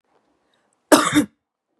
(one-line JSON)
{"cough_length": "1.8 s", "cough_amplitude": 32767, "cough_signal_mean_std_ratio": 0.3, "survey_phase": "beta (2021-08-13 to 2022-03-07)", "age": "18-44", "gender": "Female", "wearing_mask": "No", "symptom_cough_any": true, "symptom_runny_or_blocked_nose": true, "symptom_fatigue": true, "symptom_headache": true, "symptom_onset": "6 days", "smoker_status": "Never smoked", "respiratory_condition_asthma": false, "respiratory_condition_other": false, "recruitment_source": "Test and Trace", "submission_delay": "2 days", "covid_test_result": "Positive", "covid_test_method": "RT-qPCR", "covid_ct_value": 25.5, "covid_ct_gene": "ORF1ab gene"}